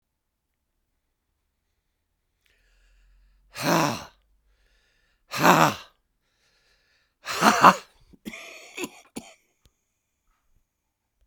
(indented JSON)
{
  "exhalation_length": "11.3 s",
  "exhalation_amplitude": 32767,
  "exhalation_signal_mean_std_ratio": 0.24,
  "survey_phase": "beta (2021-08-13 to 2022-03-07)",
  "age": "65+",
  "gender": "Male",
  "wearing_mask": "No",
  "symptom_cough_any": true,
  "symptom_runny_or_blocked_nose": true,
  "symptom_shortness_of_breath": true,
  "symptom_fatigue": true,
  "symptom_change_to_sense_of_smell_or_taste": true,
  "symptom_onset": "3 days",
  "smoker_status": "Ex-smoker",
  "respiratory_condition_asthma": false,
  "respiratory_condition_other": false,
  "recruitment_source": "Test and Trace",
  "submission_delay": "2 days",
  "covid_test_result": "Positive",
  "covid_test_method": "ePCR"
}